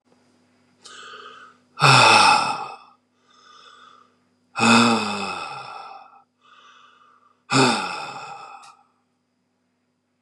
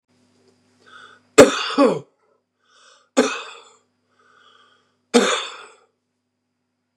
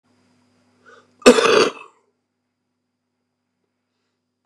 {"exhalation_length": "10.2 s", "exhalation_amplitude": 31402, "exhalation_signal_mean_std_ratio": 0.37, "three_cough_length": "7.0 s", "three_cough_amplitude": 32768, "three_cough_signal_mean_std_ratio": 0.26, "cough_length": "4.5 s", "cough_amplitude": 32768, "cough_signal_mean_std_ratio": 0.23, "survey_phase": "beta (2021-08-13 to 2022-03-07)", "age": "65+", "gender": "Male", "wearing_mask": "No", "symptom_none": true, "smoker_status": "Never smoked", "respiratory_condition_asthma": true, "respiratory_condition_other": false, "recruitment_source": "REACT", "submission_delay": "3 days", "covid_test_result": "Negative", "covid_test_method": "RT-qPCR", "influenza_a_test_result": "Negative", "influenza_b_test_result": "Negative"}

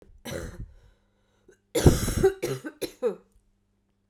{"cough_length": "4.1 s", "cough_amplitude": 20892, "cough_signal_mean_std_ratio": 0.36, "survey_phase": "beta (2021-08-13 to 2022-03-07)", "age": "45-64", "gender": "Female", "wearing_mask": "No", "symptom_cough_any": true, "symptom_runny_or_blocked_nose": true, "symptom_headache": true, "symptom_change_to_sense_of_smell_or_taste": true, "symptom_loss_of_taste": true, "symptom_other": true, "symptom_onset": "4 days", "smoker_status": "Never smoked", "respiratory_condition_asthma": false, "respiratory_condition_other": false, "recruitment_source": "Test and Trace", "submission_delay": "2 days", "covid_test_result": "Positive", "covid_test_method": "RT-qPCR", "covid_ct_value": 13.2, "covid_ct_gene": "ORF1ab gene", "covid_ct_mean": 13.7, "covid_viral_load": "32000000 copies/ml", "covid_viral_load_category": "High viral load (>1M copies/ml)"}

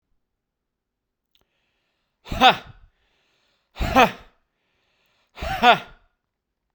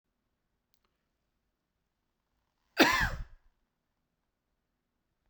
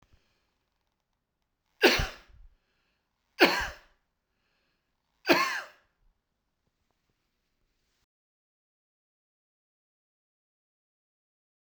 {"exhalation_length": "6.7 s", "exhalation_amplitude": 32767, "exhalation_signal_mean_std_ratio": 0.24, "cough_length": "5.3 s", "cough_amplitude": 13987, "cough_signal_mean_std_ratio": 0.2, "three_cough_length": "11.8 s", "three_cough_amplitude": 15588, "three_cough_signal_mean_std_ratio": 0.19, "survey_phase": "beta (2021-08-13 to 2022-03-07)", "age": "45-64", "gender": "Male", "wearing_mask": "No", "symptom_none": true, "smoker_status": "Never smoked", "respiratory_condition_asthma": false, "respiratory_condition_other": false, "recruitment_source": "REACT", "submission_delay": "0 days", "covid_test_result": "Negative", "covid_test_method": "RT-qPCR"}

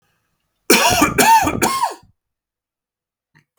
{"three_cough_length": "3.6 s", "three_cough_amplitude": 32768, "three_cough_signal_mean_std_ratio": 0.46, "survey_phase": "beta (2021-08-13 to 2022-03-07)", "age": "18-44", "gender": "Male", "wearing_mask": "No", "symptom_runny_or_blocked_nose": true, "symptom_onset": "3 days", "smoker_status": "Never smoked", "respiratory_condition_asthma": false, "respiratory_condition_other": false, "recruitment_source": "REACT", "submission_delay": "1 day", "covid_test_result": "Negative", "covid_test_method": "RT-qPCR", "influenza_a_test_result": "Unknown/Void", "influenza_b_test_result": "Unknown/Void"}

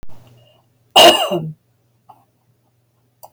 {"cough_length": "3.3 s", "cough_amplitude": 32551, "cough_signal_mean_std_ratio": 0.3, "survey_phase": "beta (2021-08-13 to 2022-03-07)", "age": "65+", "gender": "Female", "wearing_mask": "No", "symptom_none": true, "smoker_status": "Never smoked", "respiratory_condition_asthma": false, "respiratory_condition_other": false, "recruitment_source": "REACT", "submission_delay": "5 days", "covid_test_result": "Negative", "covid_test_method": "RT-qPCR", "influenza_a_test_result": "Negative", "influenza_b_test_result": "Negative"}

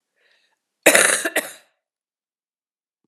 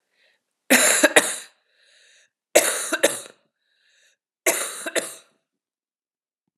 {"cough_length": "3.1 s", "cough_amplitude": 32768, "cough_signal_mean_std_ratio": 0.28, "three_cough_length": "6.6 s", "three_cough_amplitude": 32767, "three_cough_signal_mean_std_ratio": 0.33, "survey_phase": "alpha (2021-03-01 to 2021-08-12)", "age": "45-64", "gender": "Female", "wearing_mask": "No", "symptom_cough_any": true, "symptom_fatigue": true, "symptom_headache": true, "symptom_change_to_sense_of_smell_or_taste": true, "symptom_onset": "3 days", "smoker_status": "Never smoked", "respiratory_condition_asthma": false, "respiratory_condition_other": false, "recruitment_source": "Test and Trace", "submission_delay": "2 days", "covid_test_result": "Positive", "covid_test_method": "RT-qPCR", "covid_ct_value": 15.3, "covid_ct_gene": "ORF1ab gene", "covid_ct_mean": 15.5, "covid_viral_load": "8100000 copies/ml", "covid_viral_load_category": "High viral load (>1M copies/ml)"}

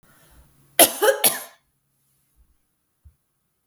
{"cough_length": "3.7 s", "cough_amplitude": 32768, "cough_signal_mean_std_ratio": 0.25, "survey_phase": "beta (2021-08-13 to 2022-03-07)", "age": "45-64", "gender": "Female", "wearing_mask": "No", "symptom_fatigue": true, "symptom_headache": true, "smoker_status": "Never smoked", "respiratory_condition_asthma": false, "respiratory_condition_other": false, "recruitment_source": "Test and Trace", "submission_delay": "1 day", "covid_test_result": "Positive", "covid_test_method": "RT-qPCR", "covid_ct_value": 26.3, "covid_ct_gene": "N gene"}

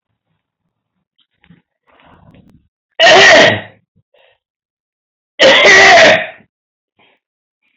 {"cough_length": "7.8 s", "cough_amplitude": 32768, "cough_signal_mean_std_ratio": 0.41, "survey_phase": "alpha (2021-03-01 to 2021-08-12)", "age": "45-64", "gender": "Male", "wearing_mask": "No", "symptom_none": true, "smoker_status": "Never smoked", "respiratory_condition_asthma": false, "respiratory_condition_other": false, "recruitment_source": "REACT", "submission_delay": "2 days", "covid_test_result": "Negative", "covid_test_method": "RT-qPCR"}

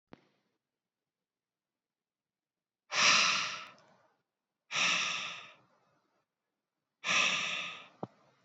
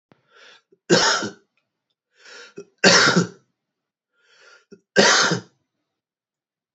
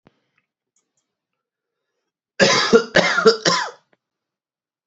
{"exhalation_length": "8.4 s", "exhalation_amplitude": 7621, "exhalation_signal_mean_std_ratio": 0.38, "three_cough_length": "6.7 s", "three_cough_amplitude": 28861, "three_cough_signal_mean_std_ratio": 0.34, "cough_length": "4.9 s", "cough_amplitude": 28520, "cough_signal_mean_std_ratio": 0.35, "survey_phase": "alpha (2021-03-01 to 2021-08-12)", "age": "18-44", "gender": "Male", "wearing_mask": "No", "symptom_cough_any": true, "symptom_fatigue": true, "symptom_fever_high_temperature": true, "symptom_headache": true, "symptom_change_to_sense_of_smell_or_taste": true, "symptom_loss_of_taste": true, "symptom_onset": "2 days", "smoker_status": "Never smoked", "respiratory_condition_asthma": false, "respiratory_condition_other": false, "recruitment_source": "Test and Trace", "submission_delay": "2 days", "covid_test_result": "Positive", "covid_test_method": "RT-qPCR"}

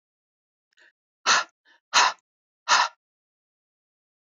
{"exhalation_length": "4.4 s", "exhalation_amplitude": 18250, "exhalation_signal_mean_std_ratio": 0.28, "survey_phase": "beta (2021-08-13 to 2022-03-07)", "age": "18-44", "gender": "Female", "wearing_mask": "No", "symptom_runny_or_blocked_nose": true, "symptom_headache": true, "smoker_status": "Current smoker (1 to 10 cigarettes per day)", "respiratory_condition_asthma": false, "respiratory_condition_other": false, "recruitment_source": "REACT", "submission_delay": "1 day", "covid_test_result": "Positive", "covid_test_method": "RT-qPCR", "covid_ct_value": 27.0, "covid_ct_gene": "E gene", "influenza_a_test_result": "Unknown/Void", "influenza_b_test_result": "Unknown/Void"}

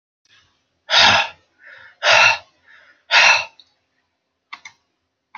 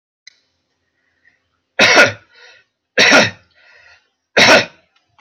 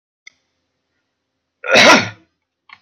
{"exhalation_length": "5.4 s", "exhalation_amplitude": 32768, "exhalation_signal_mean_std_ratio": 0.36, "three_cough_length": "5.2 s", "three_cough_amplitude": 32480, "three_cough_signal_mean_std_ratio": 0.36, "cough_length": "2.8 s", "cough_amplitude": 32768, "cough_signal_mean_std_ratio": 0.31, "survey_phase": "beta (2021-08-13 to 2022-03-07)", "age": "45-64", "gender": "Male", "wearing_mask": "No", "symptom_cough_any": true, "smoker_status": "Ex-smoker", "respiratory_condition_asthma": false, "respiratory_condition_other": false, "recruitment_source": "REACT", "submission_delay": "3 days", "covid_test_result": "Negative", "covid_test_method": "RT-qPCR"}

